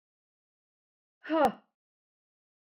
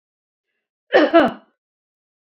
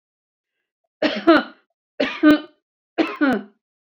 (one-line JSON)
{"exhalation_length": "2.7 s", "exhalation_amplitude": 6109, "exhalation_signal_mean_std_ratio": 0.23, "cough_length": "2.3 s", "cough_amplitude": 29358, "cough_signal_mean_std_ratio": 0.3, "three_cough_length": "3.9 s", "three_cough_amplitude": 27148, "three_cough_signal_mean_std_ratio": 0.38, "survey_phase": "beta (2021-08-13 to 2022-03-07)", "age": "65+", "gender": "Female", "wearing_mask": "No", "symptom_none": true, "smoker_status": "Never smoked", "respiratory_condition_asthma": false, "respiratory_condition_other": false, "recruitment_source": "REACT", "submission_delay": "2 days", "covid_test_result": "Negative", "covid_test_method": "RT-qPCR"}